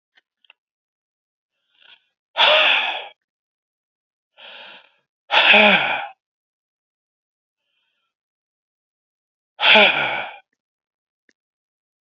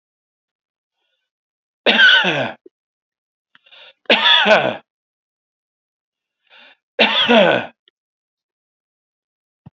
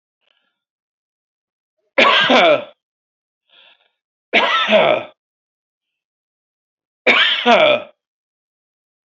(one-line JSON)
{"exhalation_length": "12.1 s", "exhalation_amplitude": 30215, "exhalation_signal_mean_std_ratio": 0.31, "cough_length": "9.7 s", "cough_amplitude": 29238, "cough_signal_mean_std_ratio": 0.35, "three_cough_length": "9.0 s", "three_cough_amplitude": 29880, "three_cough_signal_mean_std_ratio": 0.39, "survey_phase": "beta (2021-08-13 to 2022-03-07)", "age": "65+", "gender": "Male", "wearing_mask": "No", "symptom_none": true, "smoker_status": "Ex-smoker", "respiratory_condition_asthma": false, "respiratory_condition_other": false, "recruitment_source": "REACT", "submission_delay": "4 days", "covid_test_result": "Negative", "covid_test_method": "RT-qPCR"}